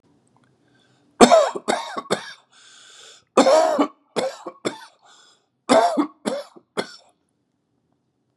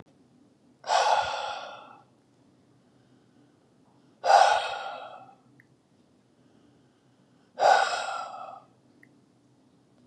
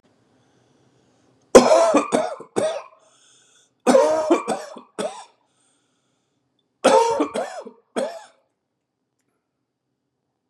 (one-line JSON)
{"cough_length": "8.4 s", "cough_amplitude": 32768, "cough_signal_mean_std_ratio": 0.36, "exhalation_length": "10.1 s", "exhalation_amplitude": 16924, "exhalation_signal_mean_std_ratio": 0.34, "three_cough_length": "10.5 s", "three_cough_amplitude": 32768, "three_cough_signal_mean_std_ratio": 0.35, "survey_phase": "beta (2021-08-13 to 2022-03-07)", "age": "65+", "gender": "Male", "wearing_mask": "No", "symptom_none": true, "symptom_onset": "12 days", "smoker_status": "Never smoked", "respiratory_condition_asthma": false, "respiratory_condition_other": false, "recruitment_source": "REACT", "submission_delay": "9 days", "covid_test_result": "Negative", "covid_test_method": "RT-qPCR", "influenza_a_test_result": "Negative", "influenza_b_test_result": "Negative"}